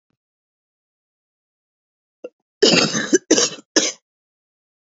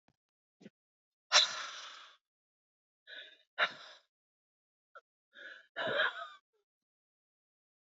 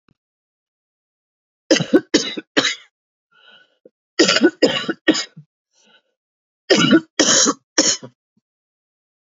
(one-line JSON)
{"cough_length": "4.9 s", "cough_amplitude": 32768, "cough_signal_mean_std_ratio": 0.31, "exhalation_length": "7.9 s", "exhalation_amplitude": 9195, "exhalation_signal_mean_std_ratio": 0.26, "three_cough_length": "9.4 s", "three_cough_amplitude": 30573, "three_cough_signal_mean_std_ratio": 0.36, "survey_phase": "beta (2021-08-13 to 2022-03-07)", "age": "45-64", "gender": "Female", "wearing_mask": "No", "symptom_cough_any": true, "symptom_runny_or_blocked_nose": true, "symptom_shortness_of_breath": true, "symptom_sore_throat": true, "symptom_headache": true, "symptom_change_to_sense_of_smell_or_taste": true, "symptom_onset": "3 days", "smoker_status": "Ex-smoker", "respiratory_condition_asthma": false, "respiratory_condition_other": false, "recruitment_source": "Test and Trace", "submission_delay": "1 day", "covid_test_result": "Negative", "covid_test_method": "RT-qPCR"}